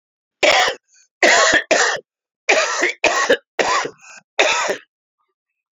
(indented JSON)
{
  "cough_length": "5.7 s",
  "cough_amplitude": 31514,
  "cough_signal_mean_std_ratio": 0.54,
  "survey_phase": "alpha (2021-03-01 to 2021-08-12)",
  "age": "45-64",
  "gender": "Male",
  "wearing_mask": "No",
  "symptom_cough_any": true,
  "symptom_new_continuous_cough": true,
  "symptom_abdominal_pain": true,
  "symptom_fatigue": true,
  "symptom_headache": true,
  "symptom_change_to_sense_of_smell_or_taste": true,
  "symptom_loss_of_taste": true,
  "smoker_status": "Never smoked",
  "respiratory_condition_asthma": false,
  "respiratory_condition_other": false,
  "recruitment_source": "Test and Trace",
  "submission_delay": "14 days",
  "covid_test_result": "Negative",
  "covid_test_method": "RT-qPCR"
}